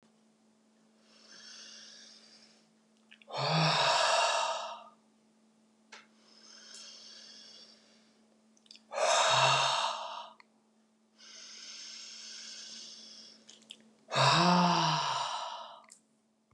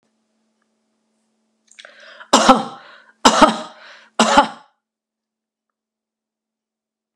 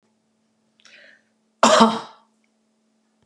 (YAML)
exhalation_length: 16.5 s
exhalation_amplitude: 7348
exhalation_signal_mean_std_ratio: 0.45
three_cough_length: 7.2 s
three_cough_amplitude: 32768
three_cough_signal_mean_std_ratio: 0.27
cough_length: 3.3 s
cough_amplitude: 32656
cough_signal_mean_std_ratio: 0.26
survey_phase: beta (2021-08-13 to 2022-03-07)
age: 45-64
gender: Female
wearing_mask: 'No'
symptom_none: true
smoker_status: Never smoked
respiratory_condition_asthma: false
respiratory_condition_other: false
recruitment_source: REACT
submission_delay: 1 day
covid_test_result: Negative
covid_test_method: RT-qPCR